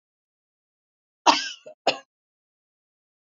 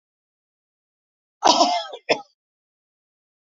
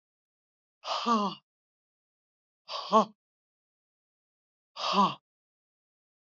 {"cough_length": "3.3 s", "cough_amplitude": 27055, "cough_signal_mean_std_ratio": 0.2, "three_cough_length": "3.5 s", "three_cough_amplitude": 26223, "three_cough_signal_mean_std_ratio": 0.28, "exhalation_length": "6.2 s", "exhalation_amplitude": 11702, "exhalation_signal_mean_std_ratio": 0.29, "survey_phase": "alpha (2021-03-01 to 2021-08-12)", "age": "65+", "gender": "Female", "wearing_mask": "No", "symptom_none": true, "smoker_status": "Never smoked", "respiratory_condition_asthma": false, "respiratory_condition_other": false, "recruitment_source": "REACT", "submission_delay": "4 days", "covid_test_result": "Negative", "covid_test_method": "RT-qPCR"}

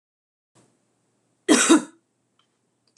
{"cough_length": "3.0 s", "cough_amplitude": 25294, "cough_signal_mean_std_ratio": 0.26, "survey_phase": "alpha (2021-03-01 to 2021-08-12)", "age": "45-64", "gender": "Female", "wearing_mask": "No", "symptom_none": true, "smoker_status": "Ex-smoker", "respiratory_condition_asthma": false, "respiratory_condition_other": false, "recruitment_source": "REACT", "submission_delay": "1 day", "covid_test_result": "Negative", "covid_test_method": "RT-qPCR"}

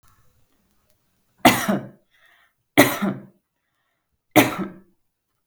{"three_cough_length": "5.5 s", "three_cough_amplitude": 32768, "three_cough_signal_mean_std_ratio": 0.28, "survey_phase": "beta (2021-08-13 to 2022-03-07)", "age": "18-44", "gender": "Female", "wearing_mask": "No", "symptom_none": true, "smoker_status": "Never smoked", "respiratory_condition_asthma": false, "respiratory_condition_other": false, "recruitment_source": "REACT", "submission_delay": "1 day", "covid_test_result": "Negative", "covid_test_method": "RT-qPCR"}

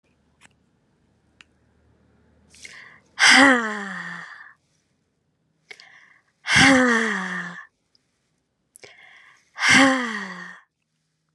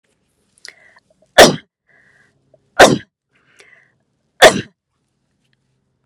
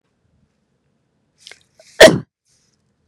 {"exhalation_length": "11.3 s", "exhalation_amplitude": 30094, "exhalation_signal_mean_std_ratio": 0.34, "three_cough_length": "6.1 s", "three_cough_amplitude": 32768, "three_cough_signal_mean_std_ratio": 0.22, "cough_length": "3.1 s", "cough_amplitude": 32768, "cough_signal_mean_std_ratio": 0.19, "survey_phase": "beta (2021-08-13 to 2022-03-07)", "age": "18-44", "gender": "Female", "wearing_mask": "No", "symptom_none": true, "smoker_status": "Never smoked", "respiratory_condition_asthma": false, "respiratory_condition_other": false, "recruitment_source": "REACT", "submission_delay": "1 day", "covid_test_result": "Negative", "covid_test_method": "RT-qPCR"}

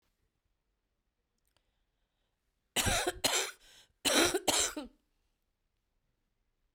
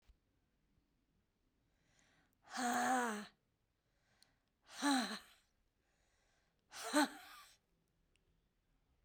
{"cough_length": "6.7 s", "cough_amplitude": 7541, "cough_signal_mean_std_ratio": 0.33, "exhalation_length": "9.0 s", "exhalation_amplitude": 3138, "exhalation_signal_mean_std_ratio": 0.32, "survey_phase": "beta (2021-08-13 to 2022-03-07)", "age": "45-64", "gender": "Female", "wearing_mask": "No", "symptom_cough_any": true, "symptom_runny_or_blocked_nose": true, "symptom_sore_throat": true, "symptom_diarrhoea": true, "symptom_headache": true, "smoker_status": "Never smoked", "respiratory_condition_asthma": false, "respiratory_condition_other": false, "recruitment_source": "Test and Trace", "submission_delay": "1 day", "covid_test_result": "Positive", "covid_test_method": "RT-qPCR", "covid_ct_value": 27.8, "covid_ct_gene": "ORF1ab gene", "covid_ct_mean": 28.8, "covid_viral_load": "350 copies/ml", "covid_viral_load_category": "Minimal viral load (< 10K copies/ml)"}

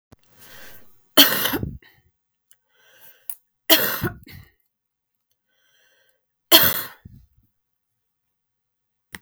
{"three_cough_length": "9.2 s", "three_cough_amplitude": 32768, "three_cough_signal_mean_std_ratio": 0.25, "survey_phase": "beta (2021-08-13 to 2022-03-07)", "age": "45-64", "gender": "Female", "wearing_mask": "No", "symptom_cough_any": true, "symptom_new_continuous_cough": true, "symptom_runny_or_blocked_nose": true, "symptom_fatigue": true, "symptom_headache": true, "symptom_change_to_sense_of_smell_or_taste": true, "symptom_loss_of_taste": true, "symptom_onset": "5 days", "smoker_status": "Ex-smoker", "respiratory_condition_asthma": false, "respiratory_condition_other": false, "recruitment_source": "Test and Trace", "submission_delay": "1 day", "covid_test_result": "Positive", "covid_test_method": "RT-qPCR", "covid_ct_value": 15.8, "covid_ct_gene": "ORF1ab gene"}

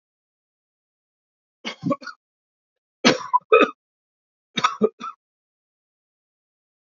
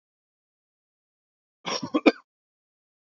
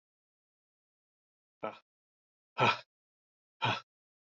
{"three_cough_length": "6.9 s", "three_cough_amplitude": 30400, "three_cough_signal_mean_std_ratio": 0.24, "cough_length": "3.2 s", "cough_amplitude": 22888, "cough_signal_mean_std_ratio": 0.18, "exhalation_length": "4.3 s", "exhalation_amplitude": 5909, "exhalation_signal_mean_std_ratio": 0.23, "survey_phase": "beta (2021-08-13 to 2022-03-07)", "age": "65+", "gender": "Male", "wearing_mask": "No", "symptom_none": true, "smoker_status": "Ex-smoker", "respiratory_condition_asthma": false, "respiratory_condition_other": false, "recruitment_source": "REACT", "submission_delay": "18 days", "covid_test_result": "Negative", "covid_test_method": "RT-qPCR", "influenza_a_test_result": "Negative", "influenza_b_test_result": "Negative"}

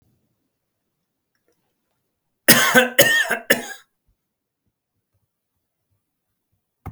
{"cough_length": "6.9 s", "cough_amplitude": 32768, "cough_signal_mean_std_ratio": 0.26, "survey_phase": "beta (2021-08-13 to 2022-03-07)", "age": "65+", "gender": "Male", "wearing_mask": "No", "symptom_none": true, "smoker_status": "Never smoked", "respiratory_condition_asthma": false, "respiratory_condition_other": false, "recruitment_source": "REACT", "submission_delay": "0 days", "covid_test_result": "Negative", "covid_test_method": "RT-qPCR"}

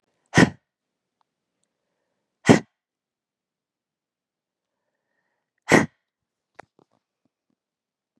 {"exhalation_length": "8.2 s", "exhalation_amplitude": 30654, "exhalation_signal_mean_std_ratio": 0.16, "survey_phase": "beta (2021-08-13 to 2022-03-07)", "age": "45-64", "gender": "Female", "wearing_mask": "No", "symptom_none": true, "smoker_status": "Ex-smoker", "respiratory_condition_asthma": false, "respiratory_condition_other": false, "recruitment_source": "REACT", "submission_delay": "3 days", "covid_test_result": "Negative", "covid_test_method": "RT-qPCR", "influenza_a_test_result": "Negative", "influenza_b_test_result": "Negative"}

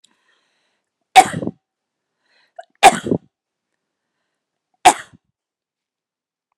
{"three_cough_length": "6.6 s", "three_cough_amplitude": 32768, "three_cough_signal_mean_std_ratio": 0.19, "survey_phase": "beta (2021-08-13 to 2022-03-07)", "age": "45-64", "gender": "Female", "wearing_mask": "No", "symptom_none": true, "smoker_status": "Never smoked", "respiratory_condition_asthma": false, "respiratory_condition_other": false, "recruitment_source": "REACT", "submission_delay": "1 day", "covid_test_result": "Negative", "covid_test_method": "RT-qPCR"}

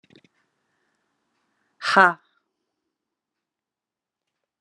{"exhalation_length": "4.6 s", "exhalation_amplitude": 28823, "exhalation_signal_mean_std_ratio": 0.16, "survey_phase": "beta (2021-08-13 to 2022-03-07)", "age": "45-64", "gender": "Female", "wearing_mask": "No", "symptom_none": true, "smoker_status": "Current smoker (1 to 10 cigarettes per day)", "respiratory_condition_asthma": false, "respiratory_condition_other": false, "recruitment_source": "REACT", "submission_delay": "0 days", "covid_test_result": "Negative", "covid_test_method": "RT-qPCR"}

